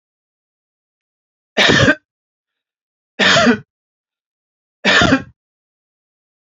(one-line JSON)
{"three_cough_length": "6.6 s", "three_cough_amplitude": 32767, "three_cough_signal_mean_std_ratio": 0.34, "survey_phase": "beta (2021-08-13 to 2022-03-07)", "age": "45-64", "gender": "Male", "wearing_mask": "No", "symptom_none": true, "smoker_status": "Ex-smoker", "respiratory_condition_asthma": false, "respiratory_condition_other": false, "recruitment_source": "REACT", "submission_delay": "5 days", "covid_test_result": "Negative", "covid_test_method": "RT-qPCR", "influenza_a_test_result": "Negative", "influenza_b_test_result": "Negative"}